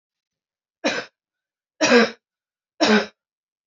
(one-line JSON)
{"three_cough_length": "3.7 s", "three_cough_amplitude": 23939, "three_cough_signal_mean_std_ratio": 0.33, "survey_phase": "beta (2021-08-13 to 2022-03-07)", "age": "18-44", "gender": "Female", "wearing_mask": "No", "symptom_cough_any": true, "symptom_runny_or_blocked_nose": true, "symptom_sore_throat": true, "symptom_fatigue": true, "symptom_headache": true, "symptom_onset": "3 days", "smoker_status": "Ex-smoker", "respiratory_condition_asthma": false, "respiratory_condition_other": false, "recruitment_source": "Test and Trace", "submission_delay": "1 day", "covid_test_result": "Positive", "covid_test_method": "RT-qPCR", "covid_ct_value": 15.3, "covid_ct_gene": "ORF1ab gene", "covid_ct_mean": 15.6, "covid_viral_load": "7800000 copies/ml", "covid_viral_load_category": "High viral load (>1M copies/ml)"}